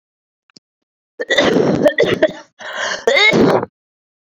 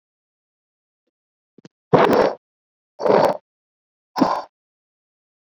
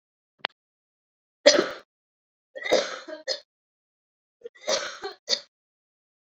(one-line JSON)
{"cough_length": "4.3 s", "cough_amplitude": 28865, "cough_signal_mean_std_ratio": 0.55, "exhalation_length": "5.5 s", "exhalation_amplitude": 27869, "exhalation_signal_mean_std_ratio": 0.32, "three_cough_length": "6.2 s", "three_cough_amplitude": 28727, "three_cough_signal_mean_std_ratio": 0.27, "survey_phase": "beta (2021-08-13 to 2022-03-07)", "age": "18-44", "gender": "Female", "wearing_mask": "No", "symptom_cough_any": true, "symptom_runny_or_blocked_nose": true, "symptom_loss_of_taste": true, "smoker_status": "Never smoked", "respiratory_condition_asthma": false, "respiratory_condition_other": false, "recruitment_source": "Test and Trace", "submission_delay": "2 days", "covid_test_result": "Positive", "covid_test_method": "RT-qPCR", "covid_ct_value": 31.7, "covid_ct_gene": "N gene", "covid_ct_mean": 32.4, "covid_viral_load": "23 copies/ml", "covid_viral_load_category": "Minimal viral load (< 10K copies/ml)"}